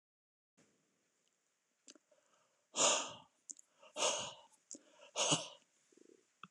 {"exhalation_length": "6.5 s", "exhalation_amplitude": 3974, "exhalation_signal_mean_std_ratio": 0.31, "survey_phase": "alpha (2021-03-01 to 2021-08-12)", "age": "65+", "gender": "Male", "wearing_mask": "No", "symptom_none": true, "smoker_status": "Never smoked", "respiratory_condition_asthma": false, "respiratory_condition_other": false, "recruitment_source": "REACT", "submission_delay": "2 days", "covid_test_result": "Negative", "covid_test_method": "RT-qPCR"}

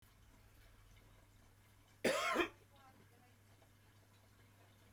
{"cough_length": "4.9 s", "cough_amplitude": 2362, "cough_signal_mean_std_ratio": 0.32, "survey_phase": "beta (2021-08-13 to 2022-03-07)", "age": "65+", "gender": "Male", "wearing_mask": "No", "symptom_cough_any": true, "symptom_onset": "8 days", "smoker_status": "Never smoked", "respiratory_condition_asthma": false, "respiratory_condition_other": false, "recruitment_source": "REACT", "submission_delay": "2 days", "covid_test_result": "Negative", "covid_test_method": "RT-qPCR", "influenza_a_test_result": "Unknown/Void", "influenza_b_test_result": "Unknown/Void"}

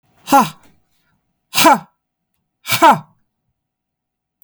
{"exhalation_length": "4.4 s", "exhalation_amplitude": 32768, "exhalation_signal_mean_std_ratio": 0.3, "survey_phase": "beta (2021-08-13 to 2022-03-07)", "age": "45-64", "gender": "Female", "wearing_mask": "No", "symptom_cough_any": true, "symptom_sore_throat": true, "symptom_fatigue": true, "symptom_headache": true, "symptom_onset": "5 days", "smoker_status": "Ex-smoker", "respiratory_condition_asthma": false, "respiratory_condition_other": false, "recruitment_source": "REACT", "submission_delay": "3 days", "covid_test_result": "Negative", "covid_test_method": "RT-qPCR", "influenza_a_test_result": "Negative", "influenza_b_test_result": "Negative"}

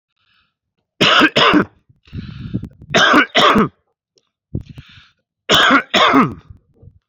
{"three_cough_length": "7.1 s", "three_cough_amplitude": 32768, "three_cough_signal_mean_std_ratio": 0.48, "survey_phase": "beta (2021-08-13 to 2022-03-07)", "age": "45-64", "gender": "Male", "wearing_mask": "No", "symptom_cough_any": true, "symptom_new_continuous_cough": true, "symptom_sore_throat": true, "symptom_onset": "11 days", "smoker_status": "Never smoked", "respiratory_condition_asthma": false, "respiratory_condition_other": false, "recruitment_source": "REACT", "submission_delay": "1 day", "covid_test_result": "Negative", "covid_test_method": "RT-qPCR", "covid_ct_value": 38.0, "covid_ct_gene": "E gene"}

